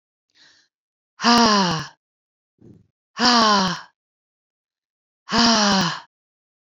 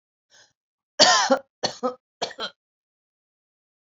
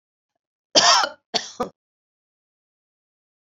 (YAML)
exhalation_length: 6.7 s
exhalation_amplitude: 26881
exhalation_signal_mean_std_ratio: 0.44
three_cough_length: 3.9 s
three_cough_amplitude: 28152
three_cough_signal_mean_std_ratio: 0.3
cough_length: 3.4 s
cough_amplitude: 30513
cough_signal_mean_std_ratio: 0.28
survey_phase: alpha (2021-03-01 to 2021-08-12)
age: 65+
gender: Female
wearing_mask: 'No'
symptom_fatigue: true
smoker_status: Never smoked
respiratory_condition_asthma: false
respiratory_condition_other: false
recruitment_source: Test and Trace
submission_delay: 2 days
covid_test_result: Positive
covid_test_method: RT-qPCR
covid_ct_value: 35.1
covid_ct_gene: N gene
covid_ct_mean: 35.1
covid_viral_load: 3.1 copies/ml
covid_viral_load_category: Minimal viral load (< 10K copies/ml)